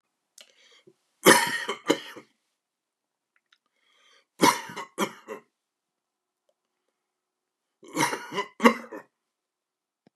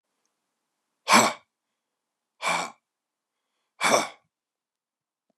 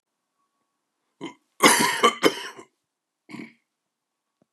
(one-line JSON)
{"three_cough_length": "10.2 s", "three_cough_amplitude": 29613, "three_cough_signal_mean_std_ratio": 0.25, "exhalation_length": "5.4 s", "exhalation_amplitude": 25342, "exhalation_signal_mean_std_ratio": 0.26, "cough_length": "4.5 s", "cough_amplitude": 28978, "cough_signal_mean_std_ratio": 0.29, "survey_phase": "beta (2021-08-13 to 2022-03-07)", "age": "65+", "gender": "Male", "wearing_mask": "No", "symptom_new_continuous_cough": true, "symptom_runny_or_blocked_nose": true, "symptom_sore_throat": true, "smoker_status": "Ex-smoker", "respiratory_condition_asthma": false, "respiratory_condition_other": true, "recruitment_source": "REACT", "submission_delay": "1 day", "covid_test_result": "Positive", "covid_test_method": "RT-qPCR", "covid_ct_value": 24.6, "covid_ct_gene": "E gene", "influenza_a_test_result": "Negative", "influenza_b_test_result": "Negative"}